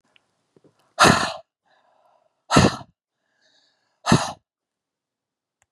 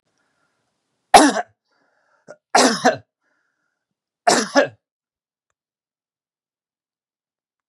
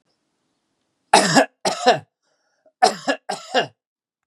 {"exhalation_length": "5.7 s", "exhalation_amplitude": 30537, "exhalation_signal_mean_std_ratio": 0.26, "three_cough_length": "7.7 s", "three_cough_amplitude": 32768, "three_cough_signal_mean_std_ratio": 0.25, "cough_length": "4.3 s", "cough_amplitude": 32767, "cough_signal_mean_std_ratio": 0.35, "survey_phase": "beta (2021-08-13 to 2022-03-07)", "age": "45-64", "gender": "Male", "wearing_mask": "No", "symptom_none": true, "smoker_status": "Never smoked", "respiratory_condition_asthma": false, "respiratory_condition_other": false, "recruitment_source": "REACT", "submission_delay": "2 days", "covid_test_result": "Negative", "covid_test_method": "RT-qPCR", "influenza_a_test_result": "Negative", "influenza_b_test_result": "Negative"}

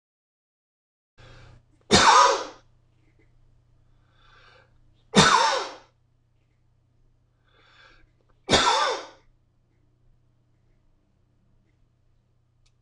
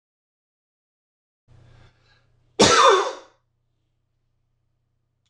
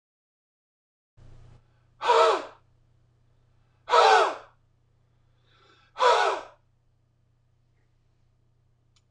{"three_cough_length": "12.8 s", "three_cough_amplitude": 23651, "three_cough_signal_mean_std_ratio": 0.28, "cough_length": "5.3 s", "cough_amplitude": 26027, "cough_signal_mean_std_ratio": 0.25, "exhalation_length": "9.1 s", "exhalation_amplitude": 16286, "exhalation_signal_mean_std_ratio": 0.3, "survey_phase": "beta (2021-08-13 to 2022-03-07)", "age": "45-64", "gender": "Male", "wearing_mask": "No", "symptom_none": true, "smoker_status": "Ex-smoker", "respiratory_condition_asthma": false, "respiratory_condition_other": false, "recruitment_source": "REACT", "submission_delay": "0 days", "covid_test_result": "Negative", "covid_test_method": "RT-qPCR", "influenza_a_test_result": "Negative", "influenza_b_test_result": "Negative"}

